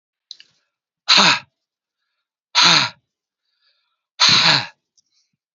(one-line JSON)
{"exhalation_length": "5.5 s", "exhalation_amplitude": 31295, "exhalation_signal_mean_std_ratio": 0.35, "survey_phase": "beta (2021-08-13 to 2022-03-07)", "age": "45-64", "gender": "Male", "wearing_mask": "No", "symptom_none": true, "symptom_onset": "8 days", "smoker_status": "Ex-smoker", "respiratory_condition_asthma": false, "respiratory_condition_other": false, "recruitment_source": "REACT", "submission_delay": "2 days", "covid_test_result": "Negative", "covid_test_method": "RT-qPCR", "influenza_a_test_result": "Negative", "influenza_b_test_result": "Negative"}